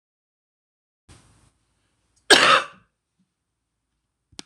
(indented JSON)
{
  "cough_length": "4.5 s",
  "cough_amplitude": 26028,
  "cough_signal_mean_std_ratio": 0.21,
  "survey_phase": "beta (2021-08-13 to 2022-03-07)",
  "age": "45-64",
  "gender": "Female",
  "wearing_mask": "No",
  "symptom_new_continuous_cough": true,
  "symptom_runny_or_blocked_nose": true,
  "symptom_sore_throat": true,
  "symptom_fatigue": true,
  "symptom_fever_high_temperature": true,
  "symptom_headache": true,
  "symptom_change_to_sense_of_smell_or_taste": true,
  "symptom_loss_of_taste": true,
  "symptom_onset": "3 days",
  "smoker_status": "Current smoker (11 or more cigarettes per day)",
  "respiratory_condition_asthma": false,
  "respiratory_condition_other": false,
  "recruitment_source": "Test and Trace",
  "submission_delay": "1 day",
  "covid_test_result": "Positive",
  "covid_test_method": "RT-qPCR",
  "covid_ct_value": 18.4,
  "covid_ct_gene": "ORF1ab gene",
  "covid_ct_mean": 18.8,
  "covid_viral_load": "710000 copies/ml",
  "covid_viral_load_category": "Low viral load (10K-1M copies/ml)"
}